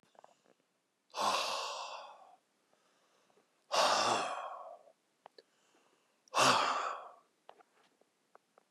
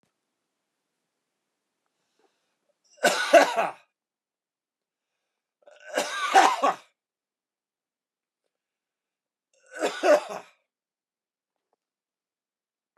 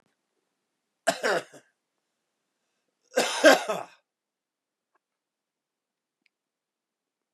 {
  "exhalation_length": "8.7 s",
  "exhalation_amplitude": 7265,
  "exhalation_signal_mean_std_ratio": 0.4,
  "three_cough_length": "13.0 s",
  "three_cough_amplitude": 25204,
  "three_cough_signal_mean_std_ratio": 0.25,
  "cough_length": "7.3 s",
  "cough_amplitude": 26190,
  "cough_signal_mean_std_ratio": 0.21,
  "survey_phase": "beta (2021-08-13 to 2022-03-07)",
  "age": "45-64",
  "gender": "Male",
  "wearing_mask": "No",
  "symptom_new_continuous_cough": true,
  "symptom_runny_or_blocked_nose": true,
  "smoker_status": "Never smoked",
  "respiratory_condition_asthma": false,
  "respiratory_condition_other": false,
  "recruitment_source": "Test and Trace",
  "submission_delay": "0 days",
  "covid_test_result": "Positive",
  "covid_test_method": "LFT"
}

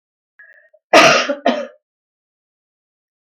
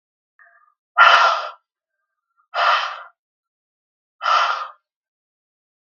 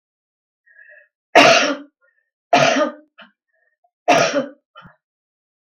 {
  "cough_length": "3.2 s",
  "cough_amplitude": 32768,
  "cough_signal_mean_std_ratio": 0.32,
  "exhalation_length": "6.0 s",
  "exhalation_amplitude": 32768,
  "exhalation_signal_mean_std_ratio": 0.35,
  "three_cough_length": "5.7 s",
  "three_cough_amplitude": 32768,
  "three_cough_signal_mean_std_ratio": 0.35,
  "survey_phase": "beta (2021-08-13 to 2022-03-07)",
  "age": "65+",
  "gender": "Female",
  "wearing_mask": "No",
  "symptom_none": true,
  "smoker_status": "Ex-smoker",
  "respiratory_condition_asthma": false,
  "respiratory_condition_other": false,
  "recruitment_source": "REACT",
  "submission_delay": "10 days",
  "covid_test_result": "Negative",
  "covid_test_method": "RT-qPCR",
  "influenza_a_test_result": "Negative",
  "influenza_b_test_result": "Negative"
}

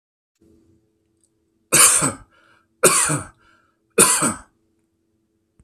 {
  "three_cough_length": "5.6 s",
  "three_cough_amplitude": 32768,
  "three_cough_signal_mean_std_ratio": 0.35,
  "survey_phase": "beta (2021-08-13 to 2022-03-07)",
  "age": "45-64",
  "gender": "Male",
  "wearing_mask": "No",
  "symptom_none": true,
  "smoker_status": "Never smoked",
  "respiratory_condition_asthma": false,
  "respiratory_condition_other": false,
  "recruitment_source": "REACT",
  "submission_delay": "33 days",
  "covid_test_result": "Negative",
  "covid_test_method": "RT-qPCR",
  "influenza_a_test_result": "Negative",
  "influenza_b_test_result": "Negative"
}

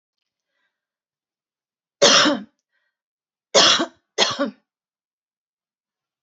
{
  "three_cough_length": "6.2 s",
  "three_cough_amplitude": 31588,
  "three_cough_signal_mean_std_ratio": 0.29,
  "survey_phase": "alpha (2021-03-01 to 2021-08-12)",
  "age": "65+",
  "gender": "Female",
  "wearing_mask": "No",
  "symptom_none": true,
  "symptom_onset": "9 days",
  "smoker_status": "Never smoked",
  "respiratory_condition_asthma": false,
  "respiratory_condition_other": false,
  "recruitment_source": "REACT",
  "submission_delay": "1 day",
  "covid_test_result": "Negative",
  "covid_test_method": "RT-qPCR"
}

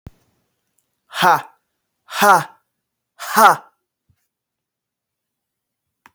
{
  "exhalation_length": "6.1 s",
  "exhalation_amplitude": 32232,
  "exhalation_signal_mean_std_ratio": 0.27,
  "survey_phase": "alpha (2021-03-01 to 2021-08-12)",
  "age": "18-44",
  "gender": "Male",
  "wearing_mask": "No",
  "symptom_fatigue": true,
  "symptom_fever_high_temperature": true,
  "symptom_onset": "3 days",
  "smoker_status": "Never smoked",
  "respiratory_condition_asthma": false,
  "respiratory_condition_other": false,
  "recruitment_source": "Test and Trace",
  "submission_delay": "2 days",
  "covid_ct_value": 26.9,
  "covid_ct_gene": "ORF1ab gene"
}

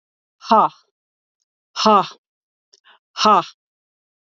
{
  "exhalation_length": "4.4 s",
  "exhalation_amplitude": 27799,
  "exhalation_signal_mean_std_ratio": 0.3,
  "survey_phase": "beta (2021-08-13 to 2022-03-07)",
  "age": "45-64",
  "gender": "Female",
  "wearing_mask": "No",
  "symptom_none": true,
  "smoker_status": "Never smoked",
  "respiratory_condition_asthma": false,
  "respiratory_condition_other": false,
  "recruitment_source": "REACT",
  "submission_delay": "2 days",
  "covid_test_result": "Negative",
  "covid_test_method": "RT-qPCR",
  "influenza_a_test_result": "Negative",
  "influenza_b_test_result": "Negative"
}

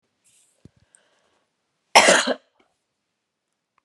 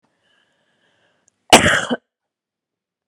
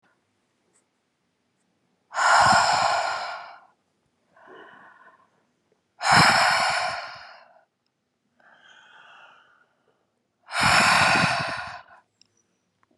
{
  "three_cough_length": "3.8 s",
  "three_cough_amplitude": 32649,
  "three_cough_signal_mean_std_ratio": 0.23,
  "cough_length": "3.1 s",
  "cough_amplitude": 32768,
  "cough_signal_mean_std_ratio": 0.24,
  "exhalation_length": "13.0 s",
  "exhalation_amplitude": 20033,
  "exhalation_signal_mean_std_ratio": 0.41,
  "survey_phase": "beta (2021-08-13 to 2022-03-07)",
  "age": "45-64",
  "gender": "Female",
  "wearing_mask": "No",
  "symptom_none": true,
  "smoker_status": "Ex-smoker",
  "respiratory_condition_asthma": false,
  "respiratory_condition_other": false,
  "recruitment_source": "REACT",
  "submission_delay": "0 days",
  "covid_test_result": "Negative",
  "covid_test_method": "RT-qPCR"
}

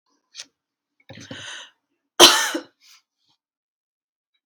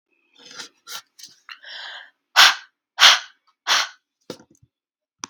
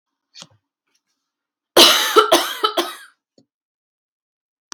{
  "cough_length": "4.5 s",
  "cough_amplitude": 32768,
  "cough_signal_mean_std_ratio": 0.21,
  "exhalation_length": "5.3 s",
  "exhalation_amplitude": 32768,
  "exhalation_signal_mean_std_ratio": 0.27,
  "three_cough_length": "4.7 s",
  "three_cough_amplitude": 32768,
  "three_cough_signal_mean_std_ratio": 0.31,
  "survey_phase": "beta (2021-08-13 to 2022-03-07)",
  "age": "18-44",
  "gender": "Female",
  "wearing_mask": "No",
  "symptom_none": true,
  "smoker_status": "Never smoked",
  "respiratory_condition_asthma": false,
  "respiratory_condition_other": false,
  "recruitment_source": "REACT",
  "submission_delay": "1 day",
  "covid_test_result": "Negative",
  "covid_test_method": "RT-qPCR"
}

